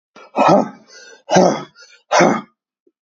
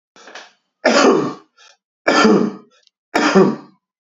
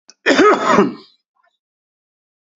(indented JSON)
{
  "exhalation_length": "3.2 s",
  "exhalation_amplitude": 29366,
  "exhalation_signal_mean_std_ratio": 0.45,
  "three_cough_length": "4.1 s",
  "three_cough_amplitude": 29979,
  "three_cough_signal_mean_std_ratio": 0.48,
  "cough_length": "2.6 s",
  "cough_amplitude": 31585,
  "cough_signal_mean_std_ratio": 0.41,
  "survey_phase": "beta (2021-08-13 to 2022-03-07)",
  "age": "45-64",
  "gender": "Male",
  "wearing_mask": "No",
  "symptom_cough_any": true,
  "symptom_fever_high_temperature": true,
  "symptom_headache": true,
  "symptom_onset": "3 days",
  "smoker_status": "Ex-smoker",
  "respiratory_condition_asthma": false,
  "respiratory_condition_other": false,
  "recruitment_source": "Test and Trace",
  "submission_delay": "2 days",
  "covid_test_result": "Positive",
  "covid_test_method": "RT-qPCR",
  "covid_ct_value": 26.7,
  "covid_ct_gene": "ORF1ab gene",
  "covid_ct_mean": 27.3,
  "covid_viral_load": "1100 copies/ml",
  "covid_viral_load_category": "Minimal viral load (< 10K copies/ml)"
}